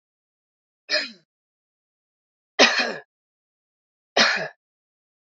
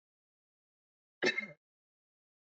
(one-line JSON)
{"three_cough_length": "5.3 s", "three_cough_amplitude": 27127, "three_cough_signal_mean_std_ratio": 0.27, "cough_length": "2.6 s", "cough_amplitude": 4496, "cough_signal_mean_std_ratio": 0.21, "survey_phase": "beta (2021-08-13 to 2022-03-07)", "age": "18-44", "gender": "Female", "wearing_mask": "No", "symptom_runny_or_blocked_nose": true, "symptom_headache": true, "smoker_status": "Ex-smoker", "respiratory_condition_asthma": false, "respiratory_condition_other": false, "recruitment_source": "Test and Trace", "submission_delay": "2 days", "covid_test_result": "Positive", "covid_test_method": "RT-qPCR", "covid_ct_value": 22.0, "covid_ct_gene": "ORF1ab gene"}